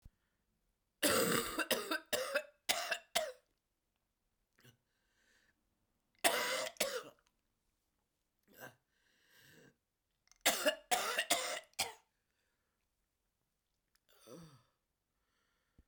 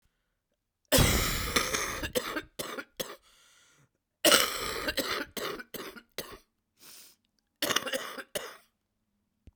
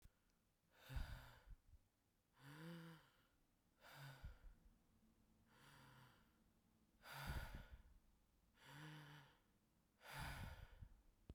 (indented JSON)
{
  "three_cough_length": "15.9 s",
  "three_cough_amplitude": 6581,
  "three_cough_signal_mean_std_ratio": 0.34,
  "cough_length": "9.6 s",
  "cough_amplitude": 22311,
  "cough_signal_mean_std_ratio": 0.42,
  "exhalation_length": "11.3 s",
  "exhalation_amplitude": 437,
  "exhalation_signal_mean_std_ratio": 0.54,
  "survey_phase": "beta (2021-08-13 to 2022-03-07)",
  "age": "45-64",
  "gender": "Female",
  "wearing_mask": "No",
  "symptom_cough_any": true,
  "symptom_new_continuous_cough": true,
  "symptom_runny_or_blocked_nose": true,
  "symptom_shortness_of_breath": true,
  "symptom_sore_throat": true,
  "symptom_fatigue": true,
  "symptom_fever_high_temperature": true,
  "symptom_other": true,
  "smoker_status": "Ex-smoker",
  "respiratory_condition_asthma": false,
  "respiratory_condition_other": false,
  "recruitment_source": "Test and Trace",
  "submission_delay": "2 days",
  "covid_test_result": "Positive",
  "covid_test_method": "RT-qPCR"
}